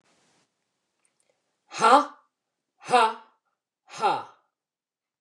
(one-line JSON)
{"exhalation_length": "5.2 s", "exhalation_amplitude": 23597, "exhalation_signal_mean_std_ratio": 0.28, "survey_phase": "beta (2021-08-13 to 2022-03-07)", "age": "65+", "gender": "Female", "wearing_mask": "No", "symptom_none": true, "smoker_status": "Never smoked", "respiratory_condition_asthma": false, "respiratory_condition_other": false, "recruitment_source": "REACT", "submission_delay": "12 days", "covid_test_result": "Negative", "covid_test_method": "RT-qPCR"}